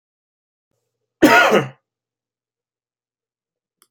{"cough_length": "3.9 s", "cough_amplitude": 29157, "cough_signal_mean_std_ratio": 0.26, "survey_phase": "alpha (2021-03-01 to 2021-08-12)", "age": "45-64", "gender": "Male", "wearing_mask": "No", "symptom_none": true, "symptom_onset": "8 days", "smoker_status": "Never smoked", "respiratory_condition_asthma": true, "respiratory_condition_other": false, "recruitment_source": "REACT", "submission_delay": "2 days", "covid_test_result": "Negative", "covid_test_method": "RT-qPCR"}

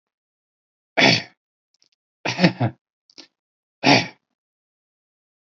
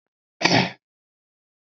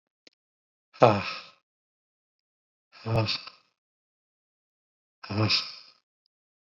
{"three_cough_length": "5.5 s", "three_cough_amplitude": 29847, "three_cough_signal_mean_std_ratio": 0.28, "cough_length": "1.7 s", "cough_amplitude": 26008, "cough_signal_mean_std_ratio": 0.3, "exhalation_length": "6.7 s", "exhalation_amplitude": 21455, "exhalation_signal_mean_std_ratio": 0.27, "survey_phase": "beta (2021-08-13 to 2022-03-07)", "age": "45-64", "gender": "Male", "wearing_mask": "No", "symptom_none": true, "smoker_status": "Never smoked", "respiratory_condition_asthma": false, "respiratory_condition_other": false, "recruitment_source": "REACT", "submission_delay": "4 days", "covid_test_result": "Negative", "covid_test_method": "RT-qPCR"}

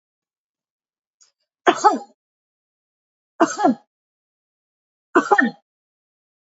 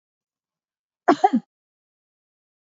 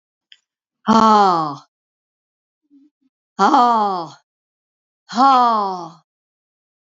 {"three_cough_length": "6.5 s", "three_cough_amplitude": 32751, "three_cough_signal_mean_std_ratio": 0.26, "cough_length": "2.7 s", "cough_amplitude": 25810, "cough_signal_mean_std_ratio": 0.2, "exhalation_length": "6.8 s", "exhalation_amplitude": 27436, "exhalation_signal_mean_std_ratio": 0.43, "survey_phase": "beta (2021-08-13 to 2022-03-07)", "age": "65+", "gender": "Female", "wearing_mask": "No", "symptom_none": true, "smoker_status": "Never smoked", "respiratory_condition_asthma": true, "respiratory_condition_other": false, "recruitment_source": "REACT", "submission_delay": "0 days", "covid_test_result": "Negative", "covid_test_method": "RT-qPCR", "influenza_a_test_result": "Negative", "influenza_b_test_result": "Negative"}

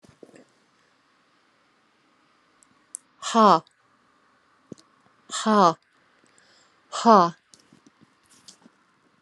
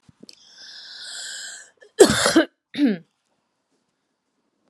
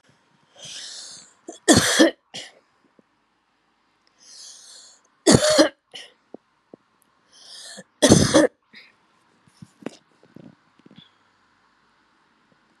{"exhalation_length": "9.2 s", "exhalation_amplitude": 26406, "exhalation_signal_mean_std_ratio": 0.23, "cough_length": "4.7 s", "cough_amplitude": 32767, "cough_signal_mean_std_ratio": 0.3, "three_cough_length": "12.8 s", "three_cough_amplitude": 32768, "three_cough_signal_mean_std_ratio": 0.27, "survey_phase": "alpha (2021-03-01 to 2021-08-12)", "age": "45-64", "gender": "Female", "wearing_mask": "No", "symptom_none": true, "smoker_status": "Current smoker (e-cigarettes or vapes only)", "respiratory_condition_asthma": false, "respiratory_condition_other": false, "recruitment_source": "REACT", "submission_delay": "1 day", "covid_test_result": "Negative", "covid_test_method": "RT-qPCR"}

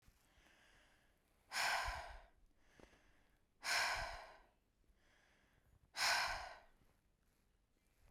{"exhalation_length": "8.1 s", "exhalation_amplitude": 2016, "exhalation_signal_mean_std_ratio": 0.39, "survey_phase": "beta (2021-08-13 to 2022-03-07)", "age": "45-64", "gender": "Female", "wearing_mask": "No", "symptom_cough_any": true, "smoker_status": "Ex-smoker", "respiratory_condition_asthma": false, "respiratory_condition_other": false, "recruitment_source": "REACT", "submission_delay": "1 day", "covid_test_result": "Negative", "covid_test_method": "RT-qPCR", "influenza_a_test_result": "Negative", "influenza_b_test_result": "Negative"}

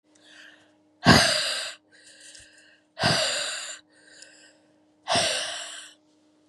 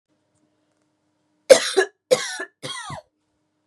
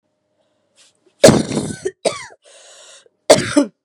{"exhalation_length": "6.5 s", "exhalation_amplitude": 23300, "exhalation_signal_mean_std_ratio": 0.4, "three_cough_length": "3.7 s", "three_cough_amplitude": 32768, "three_cough_signal_mean_std_ratio": 0.25, "cough_length": "3.8 s", "cough_amplitude": 32768, "cough_signal_mean_std_ratio": 0.32, "survey_phase": "beta (2021-08-13 to 2022-03-07)", "age": "18-44", "gender": "Female", "wearing_mask": "No", "symptom_sore_throat": true, "symptom_onset": "7 days", "smoker_status": "Never smoked", "respiratory_condition_asthma": false, "respiratory_condition_other": false, "recruitment_source": "REACT", "submission_delay": "1 day", "covid_test_result": "Negative", "covid_test_method": "RT-qPCR", "influenza_a_test_result": "Negative", "influenza_b_test_result": "Negative"}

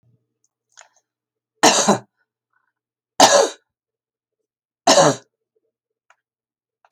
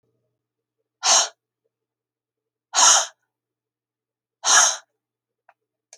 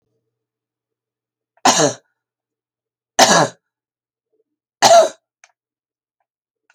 {"three_cough_length": "6.9 s", "three_cough_amplitude": 32768, "three_cough_signal_mean_std_ratio": 0.28, "exhalation_length": "6.0 s", "exhalation_amplitude": 29764, "exhalation_signal_mean_std_ratio": 0.29, "cough_length": "6.7 s", "cough_amplitude": 32463, "cough_signal_mean_std_ratio": 0.27, "survey_phase": "alpha (2021-03-01 to 2021-08-12)", "age": "65+", "gender": "Female", "wearing_mask": "No", "symptom_none": true, "smoker_status": "Ex-smoker", "respiratory_condition_asthma": false, "respiratory_condition_other": false, "recruitment_source": "REACT", "submission_delay": "32 days", "covid_test_result": "Negative", "covid_test_method": "RT-qPCR"}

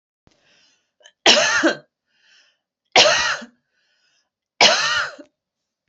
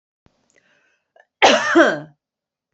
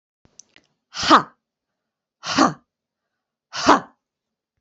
{"three_cough_length": "5.9 s", "three_cough_amplitude": 32717, "three_cough_signal_mean_std_ratio": 0.37, "cough_length": "2.7 s", "cough_amplitude": 27960, "cough_signal_mean_std_ratio": 0.35, "exhalation_length": "4.6 s", "exhalation_amplitude": 28370, "exhalation_signal_mean_std_ratio": 0.27, "survey_phase": "beta (2021-08-13 to 2022-03-07)", "age": "18-44", "gender": "Female", "wearing_mask": "No", "symptom_cough_any": true, "symptom_runny_or_blocked_nose": true, "symptom_fatigue": true, "smoker_status": "Current smoker (e-cigarettes or vapes only)", "respiratory_condition_asthma": false, "respiratory_condition_other": false, "recruitment_source": "Test and Trace", "submission_delay": "2 days", "covid_test_result": "Positive", "covid_test_method": "RT-qPCR"}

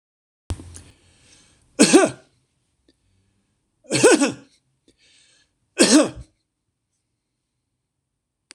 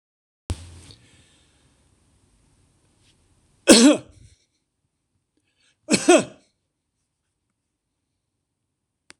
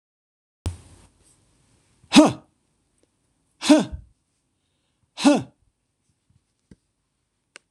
{"three_cough_length": "8.5 s", "three_cough_amplitude": 26028, "three_cough_signal_mean_std_ratio": 0.27, "cough_length": "9.2 s", "cough_amplitude": 26028, "cough_signal_mean_std_ratio": 0.2, "exhalation_length": "7.7 s", "exhalation_amplitude": 26028, "exhalation_signal_mean_std_ratio": 0.21, "survey_phase": "beta (2021-08-13 to 2022-03-07)", "age": "65+", "gender": "Male", "wearing_mask": "No", "symptom_none": true, "smoker_status": "Ex-smoker", "respiratory_condition_asthma": false, "respiratory_condition_other": false, "recruitment_source": "REACT", "submission_delay": "1 day", "covid_test_result": "Negative", "covid_test_method": "RT-qPCR", "influenza_a_test_result": "Negative", "influenza_b_test_result": "Negative"}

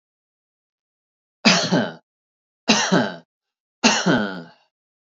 {"three_cough_length": "5.0 s", "three_cough_amplitude": 29556, "three_cough_signal_mean_std_ratio": 0.4, "survey_phase": "beta (2021-08-13 to 2022-03-07)", "age": "45-64", "gender": "Male", "wearing_mask": "No", "symptom_none": true, "smoker_status": "Never smoked", "respiratory_condition_asthma": false, "respiratory_condition_other": false, "recruitment_source": "REACT", "submission_delay": "1 day", "covid_test_result": "Negative", "covid_test_method": "RT-qPCR", "influenza_a_test_result": "Negative", "influenza_b_test_result": "Negative"}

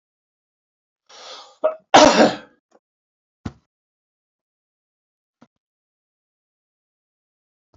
{"cough_length": "7.8 s", "cough_amplitude": 28677, "cough_signal_mean_std_ratio": 0.19, "survey_phase": "beta (2021-08-13 to 2022-03-07)", "age": "65+", "gender": "Male", "wearing_mask": "No", "symptom_none": true, "smoker_status": "Ex-smoker", "respiratory_condition_asthma": false, "respiratory_condition_other": false, "recruitment_source": "REACT", "submission_delay": "1 day", "covid_test_result": "Negative", "covid_test_method": "RT-qPCR"}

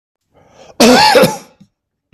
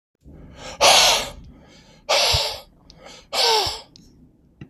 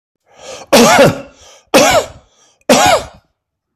{"cough_length": "2.1 s", "cough_amplitude": 32768, "cough_signal_mean_std_ratio": 0.46, "exhalation_length": "4.7 s", "exhalation_amplitude": 29648, "exhalation_signal_mean_std_ratio": 0.46, "three_cough_length": "3.8 s", "three_cough_amplitude": 32768, "three_cough_signal_mean_std_ratio": 0.49, "survey_phase": "beta (2021-08-13 to 2022-03-07)", "age": "45-64", "gender": "Male", "wearing_mask": "No", "symptom_none": true, "smoker_status": "Ex-smoker", "respiratory_condition_asthma": false, "respiratory_condition_other": false, "recruitment_source": "Test and Trace", "submission_delay": "3 days", "covid_test_result": "Negative", "covid_test_method": "RT-qPCR"}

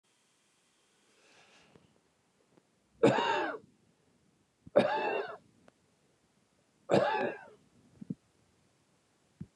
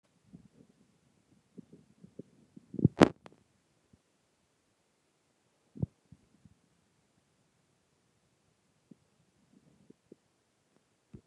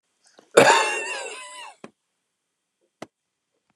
{"three_cough_length": "9.6 s", "three_cough_amplitude": 9038, "three_cough_signal_mean_std_ratio": 0.31, "exhalation_length": "11.3 s", "exhalation_amplitude": 22180, "exhalation_signal_mean_std_ratio": 0.1, "cough_length": "3.8 s", "cough_amplitude": 29204, "cough_signal_mean_std_ratio": 0.29, "survey_phase": "beta (2021-08-13 to 2022-03-07)", "age": "65+", "gender": "Male", "wearing_mask": "No", "symptom_none": true, "smoker_status": "Never smoked", "respiratory_condition_asthma": false, "respiratory_condition_other": false, "recruitment_source": "REACT", "submission_delay": "2 days", "covid_test_result": "Negative", "covid_test_method": "RT-qPCR", "influenza_a_test_result": "Negative", "influenza_b_test_result": "Negative"}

